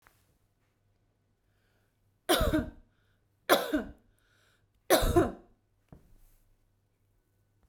{"three_cough_length": "7.7 s", "three_cough_amplitude": 11043, "three_cough_signal_mean_std_ratio": 0.3, "survey_phase": "beta (2021-08-13 to 2022-03-07)", "age": "45-64", "gender": "Female", "wearing_mask": "No", "symptom_none": true, "smoker_status": "Never smoked", "respiratory_condition_asthma": false, "respiratory_condition_other": false, "recruitment_source": "REACT", "submission_delay": "1 day", "covid_test_result": "Negative", "covid_test_method": "RT-qPCR"}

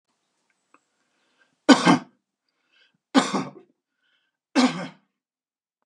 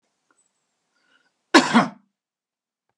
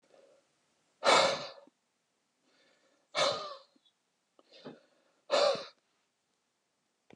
{"three_cough_length": "5.9 s", "three_cough_amplitude": 32222, "three_cough_signal_mean_std_ratio": 0.25, "cough_length": "3.0 s", "cough_amplitude": 32767, "cough_signal_mean_std_ratio": 0.22, "exhalation_length": "7.2 s", "exhalation_amplitude": 9643, "exhalation_signal_mean_std_ratio": 0.3, "survey_phase": "beta (2021-08-13 to 2022-03-07)", "age": "45-64", "gender": "Male", "wearing_mask": "No", "symptom_none": true, "smoker_status": "Never smoked", "respiratory_condition_asthma": false, "respiratory_condition_other": false, "recruitment_source": "REACT", "submission_delay": "3 days", "covid_test_result": "Negative", "covid_test_method": "RT-qPCR", "influenza_a_test_result": "Negative", "influenza_b_test_result": "Negative"}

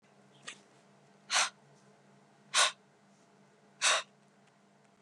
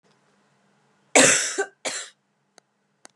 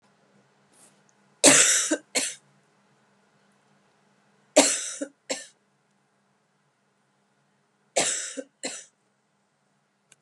{"exhalation_length": "5.0 s", "exhalation_amplitude": 8867, "exhalation_signal_mean_std_ratio": 0.29, "cough_length": "3.2 s", "cough_amplitude": 30976, "cough_signal_mean_std_ratio": 0.3, "three_cough_length": "10.2 s", "three_cough_amplitude": 32767, "three_cough_signal_mean_std_ratio": 0.27, "survey_phase": "beta (2021-08-13 to 2022-03-07)", "age": "18-44", "gender": "Female", "wearing_mask": "No", "symptom_none": true, "symptom_onset": "13 days", "smoker_status": "Ex-smoker", "respiratory_condition_asthma": false, "respiratory_condition_other": false, "recruitment_source": "REACT", "submission_delay": "1 day", "covid_test_result": "Negative", "covid_test_method": "RT-qPCR", "influenza_a_test_result": "Negative", "influenza_b_test_result": "Negative"}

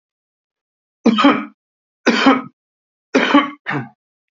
{"three_cough_length": "4.4 s", "three_cough_amplitude": 30460, "three_cough_signal_mean_std_ratio": 0.41, "survey_phase": "beta (2021-08-13 to 2022-03-07)", "age": "45-64", "gender": "Male", "wearing_mask": "No", "symptom_none": true, "smoker_status": "Ex-smoker", "respiratory_condition_asthma": false, "respiratory_condition_other": false, "recruitment_source": "Test and Trace", "submission_delay": "1 day", "covid_test_result": "Positive", "covid_test_method": "ePCR"}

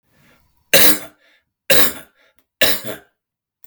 {"three_cough_length": "3.7 s", "three_cough_amplitude": 32768, "three_cough_signal_mean_std_ratio": 0.36, "survey_phase": "beta (2021-08-13 to 2022-03-07)", "age": "45-64", "gender": "Male", "wearing_mask": "No", "symptom_cough_any": true, "symptom_headache": true, "symptom_onset": "4 days", "smoker_status": "Never smoked", "respiratory_condition_asthma": false, "respiratory_condition_other": false, "recruitment_source": "Test and Trace", "submission_delay": "2 days", "covid_test_result": "Negative", "covid_test_method": "RT-qPCR"}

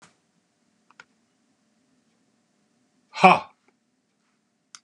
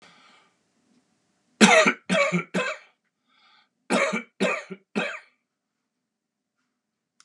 {"exhalation_length": "4.8 s", "exhalation_amplitude": 32767, "exhalation_signal_mean_std_ratio": 0.15, "cough_length": "7.2 s", "cough_amplitude": 28781, "cough_signal_mean_std_ratio": 0.33, "survey_phase": "beta (2021-08-13 to 2022-03-07)", "age": "65+", "gender": "Male", "wearing_mask": "No", "symptom_none": true, "smoker_status": "Ex-smoker", "respiratory_condition_asthma": false, "respiratory_condition_other": false, "recruitment_source": "REACT", "submission_delay": "4 days", "covid_test_result": "Negative", "covid_test_method": "RT-qPCR", "influenza_a_test_result": "Negative", "influenza_b_test_result": "Negative"}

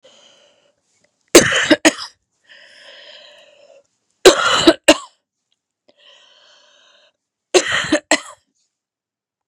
{"three_cough_length": "9.5 s", "three_cough_amplitude": 32768, "three_cough_signal_mean_std_ratio": 0.28, "survey_phase": "beta (2021-08-13 to 2022-03-07)", "age": "18-44", "gender": "Female", "wearing_mask": "No", "symptom_cough_any": true, "symptom_runny_or_blocked_nose": true, "symptom_fever_high_temperature": true, "symptom_onset": "4 days", "smoker_status": "Never smoked", "respiratory_condition_asthma": false, "respiratory_condition_other": false, "recruitment_source": "Test and Trace", "submission_delay": "1 day", "covid_test_result": "Negative", "covid_test_method": "RT-qPCR"}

